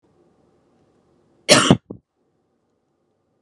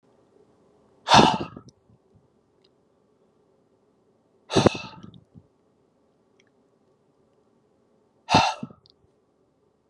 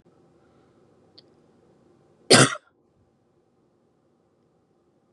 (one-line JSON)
{"cough_length": "3.4 s", "cough_amplitude": 32768, "cough_signal_mean_std_ratio": 0.21, "exhalation_length": "9.9 s", "exhalation_amplitude": 27885, "exhalation_signal_mean_std_ratio": 0.21, "three_cough_length": "5.1 s", "three_cough_amplitude": 31170, "three_cough_signal_mean_std_ratio": 0.16, "survey_phase": "beta (2021-08-13 to 2022-03-07)", "age": "18-44", "gender": "Male", "wearing_mask": "No", "symptom_none": true, "smoker_status": "Never smoked", "respiratory_condition_asthma": false, "respiratory_condition_other": false, "recruitment_source": "REACT", "submission_delay": "3 days", "covid_test_result": "Negative", "covid_test_method": "RT-qPCR", "influenza_a_test_result": "Negative", "influenza_b_test_result": "Negative"}